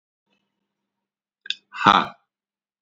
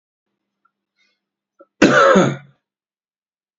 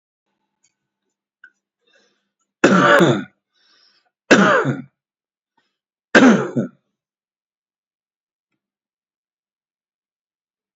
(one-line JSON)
{"exhalation_length": "2.8 s", "exhalation_amplitude": 27342, "exhalation_signal_mean_std_ratio": 0.2, "cough_length": "3.6 s", "cough_amplitude": 29705, "cough_signal_mean_std_ratio": 0.31, "three_cough_length": "10.8 s", "three_cough_amplitude": 29677, "three_cough_signal_mean_std_ratio": 0.29, "survey_phase": "beta (2021-08-13 to 2022-03-07)", "age": "45-64", "gender": "Male", "wearing_mask": "No", "symptom_cough_any": true, "symptom_change_to_sense_of_smell_or_taste": true, "symptom_onset": "4 days", "smoker_status": "Ex-smoker", "respiratory_condition_asthma": false, "respiratory_condition_other": false, "recruitment_source": "Test and Trace", "submission_delay": "2 days", "covid_test_result": "Positive", "covid_test_method": "RT-qPCR", "covid_ct_value": 23.3, "covid_ct_gene": "ORF1ab gene"}